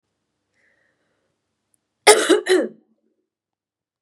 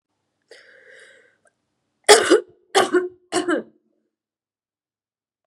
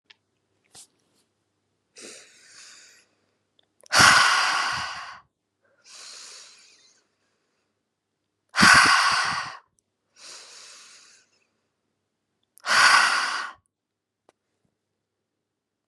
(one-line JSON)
{"cough_length": "4.0 s", "cough_amplitude": 32768, "cough_signal_mean_std_ratio": 0.26, "three_cough_length": "5.5 s", "three_cough_amplitude": 32768, "three_cough_signal_mean_std_ratio": 0.28, "exhalation_length": "15.9 s", "exhalation_amplitude": 27176, "exhalation_signal_mean_std_ratio": 0.32, "survey_phase": "beta (2021-08-13 to 2022-03-07)", "age": "18-44", "gender": "Female", "wearing_mask": "No", "symptom_cough_any": true, "symptom_runny_or_blocked_nose": true, "symptom_sore_throat": true, "symptom_headache": true, "symptom_other": true, "smoker_status": "Ex-smoker", "respiratory_condition_asthma": true, "respiratory_condition_other": false, "recruitment_source": "Test and Trace", "submission_delay": "2 days", "covid_test_result": "Positive", "covid_test_method": "LFT"}